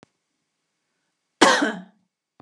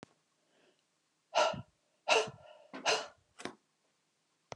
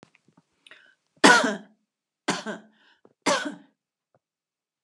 cough_length: 2.4 s
cough_amplitude: 29407
cough_signal_mean_std_ratio: 0.27
exhalation_length: 4.6 s
exhalation_amplitude: 5914
exhalation_signal_mean_std_ratio: 0.31
three_cough_length: 4.8 s
three_cough_amplitude: 32275
three_cough_signal_mean_std_ratio: 0.26
survey_phase: beta (2021-08-13 to 2022-03-07)
age: 45-64
gender: Female
wearing_mask: 'No'
symptom_none: true
smoker_status: Never smoked
respiratory_condition_asthma: true
respiratory_condition_other: false
recruitment_source: REACT
submission_delay: 1 day
covid_test_result: Negative
covid_test_method: RT-qPCR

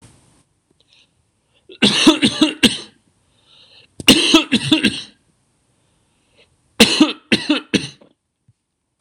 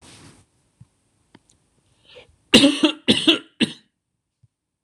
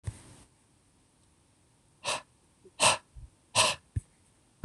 three_cough_length: 9.0 s
three_cough_amplitude: 26028
three_cough_signal_mean_std_ratio: 0.36
cough_length: 4.8 s
cough_amplitude: 26028
cough_signal_mean_std_ratio: 0.28
exhalation_length: 4.6 s
exhalation_amplitude: 12610
exhalation_signal_mean_std_ratio: 0.29
survey_phase: beta (2021-08-13 to 2022-03-07)
age: 18-44
gender: Male
wearing_mask: 'No'
symptom_none: true
smoker_status: Never smoked
respiratory_condition_asthma: false
respiratory_condition_other: false
recruitment_source: REACT
submission_delay: 1 day
covid_test_result: Negative
covid_test_method: RT-qPCR
influenza_a_test_result: Negative
influenza_b_test_result: Negative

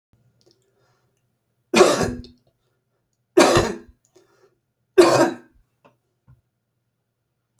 three_cough_length: 7.6 s
three_cough_amplitude: 30065
three_cough_signal_mean_std_ratio: 0.29
survey_phase: beta (2021-08-13 to 2022-03-07)
age: 65+
gender: Male
wearing_mask: 'No'
symptom_none: true
smoker_status: Ex-smoker
respiratory_condition_asthma: false
respiratory_condition_other: false
recruitment_source: REACT
submission_delay: 2 days
covid_test_result: Negative
covid_test_method: RT-qPCR
influenza_a_test_result: Negative
influenza_b_test_result: Negative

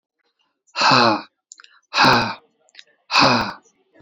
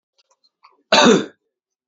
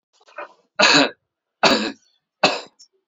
exhalation_length: 4.0 s
exhalation_amplitude: 30547
exhalation_signal_mean_std_ratio: 0.44
cough_length: 1.9 s
cough_amplitude: 31386
cough_signal_mean_std_ratio: 0.33
three_cough_length: 3.1 s
three_cough_amplitude: 30171
three_cough_signal_mean_std_ratio: 0.38
survey_phase: alpha (2021-03-01 to 2021-08-12)
age: 18-44
gender: Male
wearing_mask: 'No'
symptom_none: true
smoker_status: Never smoked
respiratory_condition_asthma: false
respiratory_condition_other: false
recruitment_source: REACT
submission_delay: 2 days
covid_test_result: Negative
covid_test_method: RT-qPCR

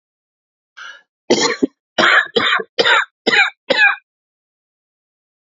cough_length: 5.5 s
cough_amplitude: 32767
cough_signal_mean_std_ratio: 0.43
survey_phase: beta (2021-08-13 to 2022-03-07)
age: 45-64
gender: Male
wearing_mask: 'No'
symptom_diarrhoea: true
symptom_fatigue: true
symptom_fever_high_temperature: true
smoker_status: Never smoked
respiratory_condition_asthma: true
respiratory_condition_other: false
recruitment_source: Test and Trace
submission_delay: 2 days
covid_test_result: Positive
covid_test_method: RT-qPCR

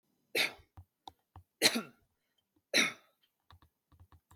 three_cough_length: 4.4 s
three_cough_amplitude: 8573
three_cough_signal_mean_std_ratio: 0.27
survey_phase: beta (2021-08-13 to 2022-03-07)
age: 45-64
gender: Male
wearing_mask: 'No'
symptom_none: true
smoker_status: Never smoked
respiratory_condition_asthma: false
respiratory_condition_other: false
recruitment_source: REACT
submission_delay: 1 day
covid_test_result: Negative
covid_test_method: RT-qPCR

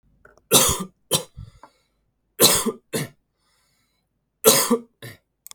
three_cough_length: 5.5 s
three_cough_amplitude: 32768
three_cough_signal_mean_std_ratio: 0.35
survey_phase: beta (2021-08-13 to 2022-03-07)
age: 45-64
gender: Male
wearing_mask: 'No'
symptom_none: true
smoker_status: Ex-smoker
respiratory_condition_asthma: false
respiratory_condition_other: false
recruitment_source: Test and Trace
submission_delay: 2 days
covid_test_result: Negative
covid_test_method: RT-qPCR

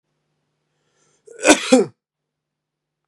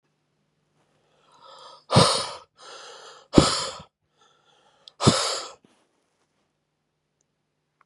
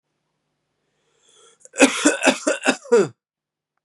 cough_length: 3.1 s
cough_amplitude: 32767
cough_signal_mean_std_ratio: 0.25
exhalation_length: 7.9 s
exhalation_amplitude: 32768
exhalation_signal_mean_std_ratio: 0.27
three_cough_length: 3.8 s
three_cough_amplitude: 32766
three_cough_signal_mean_std_ratio: 0.36
survey_phase: beta (2021-08-13 to 2022-03-07)
age: 18-44
gender: Male
wearing_mask: 'No'
symptom_new_continuous_cough: true
symptom_runny_or_blocked_nose: true
symptom_headache: true
symptom_onset: 3 days
smoker_status: Never smoked
respiratory_condition_asthma: false
respiratory_condition_other: false
recruitment_source: Test and Trace
submission_delay: 2 days
covid_test_result: Positive
covid_test_method: RT-qPCR
covid_ct_value: 21.3
covid_ct_gene: N gene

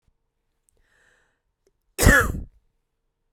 cough_length: 3.3 s
cough_amplitude: 29294
cough_signal_mean_std_ratio: 0.25
survey_phase: beta (2021-08-13 to 2022-03-07)
age: 45-64
gender: Female
wearing_mask: 'No'
symptom_cough_any: true
symptom_sore_throat: true
symptom_fatigue: true
symptom_headache: true
symptom_change_to_sense_of_smell_or_taste: true
symptom_onset: 7 days
smoker_status: Ex-smoker
respiratory_condition_asthma: false
respiratory_condition_other: false
recruitment_source: Test and Trace
submission_delay: 2 days
covid_test_result: Positive
covid_test_method: RT-qPCR
covid_ct_value: 17.5
covid_ct_gene: ORF1ab gene
covid_ct_mean: 17.7
covid_viral_load: 1600000 copies/ml
covid_viral_load_category: High viral load (>1M copies/ml)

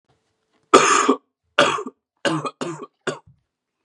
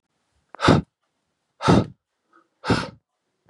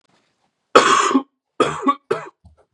three_cough_length: 3.8 s
three_cough_amplitude: 32768
three_cough_signal_mean_std_ratio: 0.38
exhalation_length: 3.5 s
exhalation_amplitude: 28709
exhalation_signal_mean_std_ratio: 0.31
cough_length: 2.7 s
cough_amplitude: 32768
cough_signal_mean_std_ratio: 0.41
survey_phase: beta (2021-08-13 to 2022-03-07)
age: 18-44
gender: Male
wearing_mask: 'No'
symptom_none: true
smoker_status: Never smoked
respiratory_condition_asthma: false
respiratory_condition_other: false
recruitment_source: REACT
submission_delay: 3 days
covid_test_result: Positive
covid_test_method: RT-qPCR
covid_ct_value: 25.0
covid_ct_gene: E gene
influenza_a_test_result: Negative
influenza_b_test_result: Negative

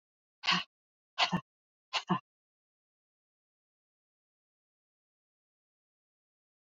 exhalation_length: 6.7 s
exhalation_amplitude: 5922
exhalation_signal_mean_std_ratio: 0.21
survey_phase: beta (2021-08-13 to 2022-03-07)
age: 45-64
gender: Female
wearing_mask: 'No'
symptom_cough_any: true
symptom_onset: 12 days
smoker_status: Never smoked
respiratory_condition_asthma: false
respiratory_condition_other: false
recruitment_source: REACT
submission_delay: 2 days
covid_test_result: Negative
covid_test_method: RT-qPCR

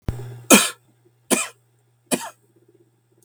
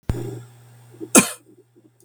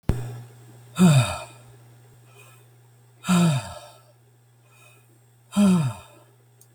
three_cough_length: 3.2 s
three_cough_amplitude: 32768
three_cough_signal_mean_std_ratio: 0.29
cough_length: 2.0 s
cough_amplitude: 32768
cough_signal_mean_std_ratio: 0.28
exhalation_length: 6.7 s
exhalation_amplitude: 17857
exhalation_signal_mean_std_ratio: 0.4
survey_phase: beta (2021-08-13 to 2022-03-07)
age: 45-64
gender: Male
wearing_mask: 'No'
symptom_cough_any: true
symptom_runny_or_blocked_nose: true
symptom_loss_of_taste: true
symptom_onset: 3 days
smoker_status: Never smoked
respiratory_condition_asthma: false
respiratory_condition_other: false
recruitment_source: Test and Trace
submission_delay: 2 days
covid_test_result: Positive
covid_test_method: RT-qPCR
covid_ct_value: 10.0
covid_ct_gene: N gene
covid_ct_mean: 11.5
covid_viral_load: 170000000 copies/ml
covid_viral_load_category: High viral load (>1M copies/ml)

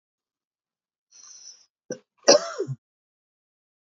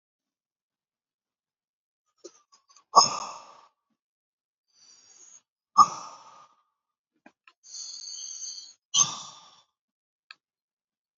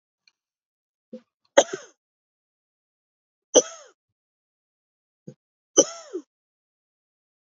cough_length: 3.9 s
cough_amplitude: 27597
cough_signal_mean_std_ratio: 0.19
exhalation_length: 11.2 s
exhalation_amplitude: 22096
exhalation_signal_mean_std_ratio: 0.19
three_cough_length: 7.6 s
three_cough_amplitude: 31300
three_cough_signal_mean_std_ratio: 0.14
survey_phase: beta (2021-08-13 to 2022-03-07)
age: 45-64
gender: Male
wearing_mask: 'No'
symptom_cough_any: true
symptom_runny_or_blocked_nose: true
symptom_shortness_of_breath: true
symptom_sore_throat: true
symptom_headache: true
symptom_onset: 2 days
smoker_status: Ex-smoker
respiratory_condition_asthma: false
respiratory_condition_other: false
recruitment_source: Test and Trace
submission_delay: 1 day
covid_test_result: Positive
covid_test_method: RT-qPCR
covid_ct_value: 15.3
covid_ct_gene: ORF1ab gene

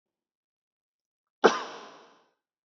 cough_length: 2.6 s
cough_amplitude: 19697
cough_signal_mean_std_ratio: 0.18
survey_phase: beta (2021-08-13 to 2022-03-07)
age: 18-44
gender: Male
wearing_mask: 'Yes'
symptom_none: true
smoker_status: Ex-smoker
respiratory_condition_asthma: false
respiratory_condition_other: false
recruitment_source: REACT
submission_delay: 1 day
covid_test_result: Negative
covid_test_method: RT-qPCR
influenza_a_test_result: Negative
influenza_b_test_result: Negative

